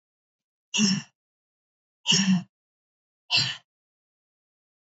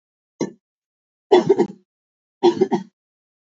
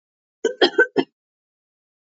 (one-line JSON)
{"exhalation_length": "4.9 s", "exhalation_amplitude": 12178, "exhalation_signal_mean_std_ratio": 0.34, "three_cough_length": "3.6 s", "three_cough_amplitude": 26530, "three_cough_signal_mean_std_ratio": 0.32, "cough_length": "2.0 s", "cough_amplitude": 26617, "cough_signal_mean_std_ratio": 0.29, "survey_phase": "beta (2021-08-13 to 2022-03-07)", "age": "18-44", "gender": "Female", "wearing_mask": "No", "symptom_runny_or_blocked_nose": true, "symptom_abdominal_pain": true, "symptom_fatigue": true, "symptom_headache": true, "symptom_change_to_sense_of_smell_or_taste": true, "symptom_onset": "2 days", "smoker_status": "Never smoked", "respiratory_condition_asthma": false, "respiratory_condition_other": false, "recruitment_source": "Test and Trace", "submission_delay": "2 days", "covid_test_result": "Positive", "covid_test_method": "RT-qPCR", "covid_ct_value": 23.1, "covid_ct_gene": "ORF1ab gene", "covid_ct_mean": 23.4, "covid_viral_load": "22000 copies/ml", "covid_viral_load_category": "Low viral load (10K-1M copies/ml)"}